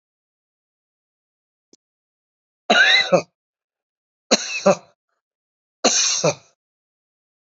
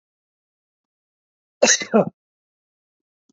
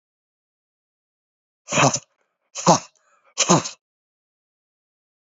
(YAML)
three_cough_length: 7.4 s
three_cough_amplitude: 32768
three_cough_signal_mean_std_ratio: 0.31
cough_length: 3.3 s
cough_amplitude: 27496
cough_signal_mean_std_ratio: 0.23
exhalation_length: 5.4 s
exhalation_amplitude: 28041
exhalation_signal_mean_std_ratio: 0.26
survey_phase: beta (2021-08-13 to 2022-03-07)
age: 45-64
gender: Male
wearing_mask: 'No'
symptom_runny_or_blocked_nose: true
symptom_headache: true
symptom_change_to_sense_of_smell_or_taste: true
smoker_status: Never smoked
respiratory_condition_asthma: false
respiratory_condition_other: false
recruitment_source: Test and Trace
submission_delay: 2 days
covid_test_result: Positive
covid_test_method: RT-qPCR